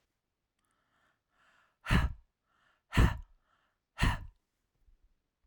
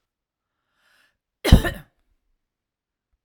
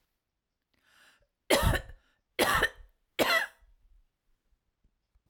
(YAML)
exhalation_length: 5.5 s
exhalation_amplitude: 7866
exhalation_signal_mean_std_ratio: 0.26
cough_length: 3.2 s
cough_amplitude: 32768
cough_signal_mean_std_ratio: 0.17
three_cough_length: 5.3 s
three_cough_amplitude: 10757
three_cough_signal_mean_std_ratio: 0.34
survey_phase: alpha (2021-03-01 to 2021-08-12)
age: 45-64
gender: Female
wearing_mask: 'No'
symptom_none: true
smoker_status: Never smoked
respiratory_condition_asthma: false
respiratory_condition_other: false
recruitment_source: REACT
submission_delay: 2 days
covid_test_result: Negative
covid_test_method: RT-qPCR